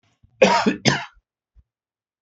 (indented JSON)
{
  "cough_length": "2.2 s",
  "cough_amplitude": 27967,
  "cough_signal_mean_std_ratio": 0.35,
  "survey_phase": "beta (2021-08-13 to 2022-03-07)",
  "age": "65+",
  "gender": "Male",
  "wearing_mask": "No",
  "symptom_none": true,
  "symptom_onset": "12 days",
  "smoker_status": "Never smoked",
  "respiratory_condition_asthma": false,
  "respiratory_condition_other": false,
  "recruitment_source": "REACT",
  "submission_delay": "3 days",
  "covid_test_result": "Negative",
  "covid_test_method": "RT-qPCR",
  "influenza_a_test_result": "Negative",
  "influenza_b_test_result": "Negative"
}